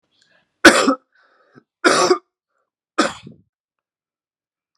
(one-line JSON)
{"three_cough_length": "4.8 s", "three_cough_amplitude": 32768, "three_cough_signal_mean_std_ratio": 0.28, "survey_phase": "beta (2021-08-13 to 2022-03-07)", "age": "45-64", "gender": "Male", "wearing_mask": "No", "symptom_cough_any": true, "symptom_runny_or_blocked_nose": true, "symptom_sore_throat": true, "symptom_onset": "4 days", "smoker_status": "Never smoked", "respiratory_condition_asthma": false, "respiratory_condition_other": false, "recruitment_source": "Test and Trace", "submission_delay": "2 days", "covid_test_result": "Positive", "covid_test_method": "RT-qPCR", "covid_ct_value": 15.1, "covid_ct_gene": "ORF1ab gene", "covid_ct_mean": 15.4, "covid_viral_load": "9100000 copies/ml", "covid_viral_load_category": "High viral load (>1M copies/ml)"}